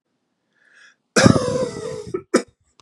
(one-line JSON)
{"cough_length": "2.8 s", "cough_amplitude": 32768, "cough_signal_mean_std_ratio": 0.37, "survey_phase": "beta (2021-08-13 to 2022-03-07)", "age": "45-64", "gender": "Male", "wearing_mask": "No", "symptom_none": true, "smoker_status": "Never smoked", "respiratory_condition_asthma": false, "respiratory_condition_other": false, "recruitment_source": "REACT", "submission_delay": "2 days", "covid_test_result": "Negative", "covid_test_method": "RT-qPCR", "influenza_a_test_result": "Negative", "influenza_b_test_result": "Negative"}